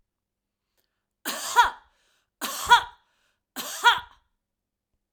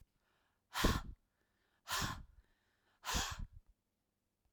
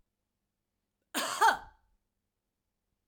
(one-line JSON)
{"three_cough_length": "5.1 s", "three_cough_amplitude": 21743, "three_cough_signal_mean_std_ratio": 0.28, "exhalation_length": "4.5 s", "exhalation_amplitude": 3374, "exhalation_signal_mean_std_ratio": 0.37, "cough_length": "3.1 s", "cough_amplitude": 8451, "cough_signal_mean_std_ratio": 0.25, "survey_phase": "alpha (2021-03-01 to 2021-08-12)", "age": "45-64", "gender": "Female", "wearing_mask": "No", "symptom_none": true, "smoker_status": "Ex-smoker", "respiratory_condition_asthma": false, "respiratory_condition_other": false, "recruitment_source": "REACT", "submission_delay": "2 days", "covid_test_result": "Negative", "covid_test_method": "RT-qPCR"}